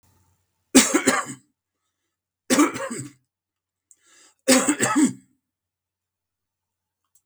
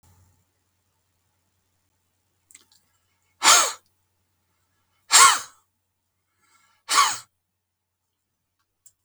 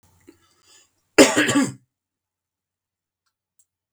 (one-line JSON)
{"three_cough_length": "7.3 s", "three_cough_amplitude": 32768, "three_cough_signal_mean_std_ratio": 0.33, "exhalation_length": "9.0 s", "exhalation_amplitude": 32768, "exhalation_signal_mean_std_ratio": 0.22, "cough_length": "3.9 s", "cough_amplitude": 32768, "cough_signal_mean_std_ratio": 0.25, "survey_phase": "beta (2021-08-13 to 2022-03-07)", "age": "65+", "gender": "Male", "wearing_mask": "No", "symptom_none": true, "smoker_status": "Ex-smoker", "respiratory_condition_asthma": false, "respiratory_condition_other": false, "recruitment_source": "REACT", "submission_delay": "1 day", "covid_test_result": "Negative", "covid_test_method": "RT-qPCR", "influenza_a_test_result": "Negative", "influenza_b_test_result": "Negative"}